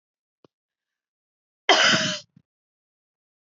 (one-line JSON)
{"cough_length": "3.6 s", "cough_amplitude": 24776, "cough_signal_mean_std_ratio": 0.27, "survey_phase": "alpha (2021-03-01 to 2021-08-12)", "age": "18-44", "gender": "Female", "wearing_mask": "No", "symptom_none": true, "smoker_status": "Never smoked", "respiratory_condition_asthma": false, "respiratory_condition_other": false, "recruitment_source": "REACT", "submission_delay": "1 day", "covid_test_result": "Negative", "covid_test_method": "RT-qPCR"}